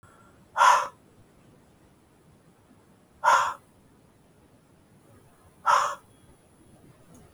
{
  "exhalation_length": "7.3 s",
  "exhalation_amplitude": 16479,
  "exhalation_signal_mean_std_ratio": 0.29,
  "survey_phase": "beta (2021-08-13 to 2022-03-07)",
  "age": "65+",
  "gender": "Male",
  "wearing_mask": "No",
  "symptom_none": true,
  "smoker_status": "Ex-smoker",
  "respiratory_condition_asthma": false,
  "respiratory_condition_other": false,
  "recruitment_source": "REACT",
  "submission_delay": "3 days",
  "covid_test_result": "Negative",
  "covid_test_method": "RT-qPCR",
  "influenza_a_test_result": "Negative",
  "influenza_b_test_result": "Negative"
}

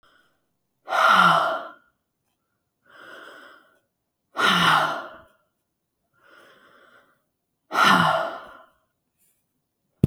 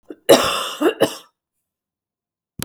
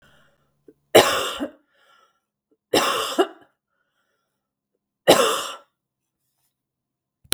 {
  "exhalation_length": "10.1 s",
  "exhalation_amplitude": 32768,
  "exhalation_signal_mean_std_ratio": 0.36,
  "cough_length": "2.6 s",
  "cough_amplitude": 32768,
  "cough_signal_mean_std_ratio": 0.35,
  "three_cough_length": "7.3 s",
  "three_cough_amplitude": 32768,
  "three_cough_signal_mean_std_ratio": 0.29,
  "survey_phase": "beta (2021-08-13 to 2022-03-07)",
  "age": "45-64",
  "gender": "Female",
  "wearing_mask": "No",
  "symptom_cough_any": true,
  "symptom_runny_or_blocked_nose": true,
  "symptom_fatigue": true,
  "symptom_onset": "12 days",
  "smoker_status": "Ex-smoker",
  "respiratory_condition_asthma": false,
  "respiratory_condition_other": false,
  "recruitment_source": "REACT",
  "submission_delay": "2 days",
  "covid_test_result": "Negative",
  "covid_test_method": "RT-qPCR",
  "influenza_a_test_result": "Negative",
  "influenza_b_test_result": "Negative"
}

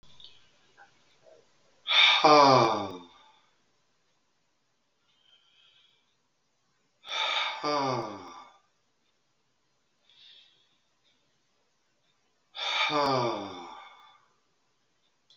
{
  "exhalation_length": "15.4 s",
  "exhalation_amplitude": 17793,
  "exhalation_signal_mean_std_ratio": 0.32,
  "survey_phase": "beta (2021-08-13 to 2022-03-07)",
  "age": "65+",
  "gender": "Male",
  "wearing_mask": "No",
  "symptom_cough_any": true,
  "symptom_runny_or_blocked_nose": true,
  "symptom_sore_throat": true,
  "symptom_onset": "8 days",
  "smoker_status": "Never smoked",
  "respiratory_condition_asthma": false,
  "respiratory_condition_other": false,
  "recruitment_source": "REACT",
  "submission_delay": "1 day",
  "covid_test_result": "Negative",
  "covid_test_method": "RT-qPCR",
  "influenza_a_test_result": "Negative",
  "influenza_b_test_result": "Negative"
}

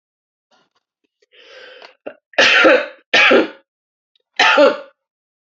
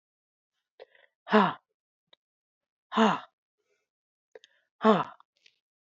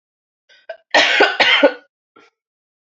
{
  "three_cough_length": "5.5 s",
  "three_cough_amplitude": 29972,
  "three_cough_signal_mean_std_ratio": 0.4,
  "exhalation_length": "5.8 s",
  "exhalation_amplitude": 13723,
  "exhalation_signal_mean_std_ratio": 0.25,
  "cough_length": "3.0 s",
  "cough_amplitude": 29721,
  "cough_signal_mean_std_ratio": 0.4,
  "survey_phase": "beta (2021-08-13 to 2022-03-07)",
  "age": "18-44",
  "gender": "Female",
  "wearing_mask": "No",
  "symptom_cough_any": true,
  "symptom_runny_or_blocked_nose": true,
  "symptom_shortness_of_breath": true,
  "symptom_abdominal_pain": true,
  "symptom_diarrhoea": true,
  "symptom_fatigue": true,
  "symptom_headache": true,
  "symptom_other": true,
  "symptom_onset": "7 days",
  "smoker_status": "Never smoked",
  "respiratory_condition_asthma": false,
  "respiratory_condition_other": false,
  "recruitment_source": "Test and Trace",
  "submission_delay": "2 days",
  "covid_test_result": "Positive",
  "covid_test_method": "RT-qPCR",
  "covid_ct_value": 21.6,
  "covid_ct_gene": "ORF1ab gene"
}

